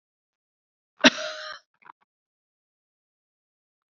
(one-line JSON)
{"cough_length": "3.9 s", "cough_amplitude": 31390, "cough_signal_mean_std_ratio": 0.15, "survey_phase": "beta (2021-08-13 to 2022-03-07)", "age": "45-64", "gender": "Female", "wearing_mask": "No", "symptom_none": true, "smoker_status": "Ex-smoker", "respiratory_condition_asthma": false, "respiratory_condition_other": false, "recruitment_source": "REACT", "submission_delay": "2 days", "covid_test_result": "Negative", "covid_test_method": "RT-qPCR", "influenza_a_test_result": "Negative", "influenza_b_test_result": "Negative"}